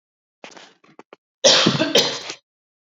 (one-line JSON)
{"cough_length": "2.8 s", "cough_amplitude": 31505, "cough_signal_mean_std_ratio": 0.4, "survey_phase": "alpha (2021-03-01 to 2021-08-12)", "age": "18-44", "gender": "Female", "wearing_mask": "No", "symptom_cough_any": true, "symptom_fatigue": true, "symptom_headache": true, "smoker_status": "Never smoked", "respiratory_condition_asthma": false, "respiratory_condition_other": false, "recruitment_source": "Test and Trace", "submission_delay": "2 days", "covid_test_result": "Positive", "covid_test_method": "RT-qPCR", "covid_ct_value": 22.9, "covid_ct_gene": "ORF1ab gene"}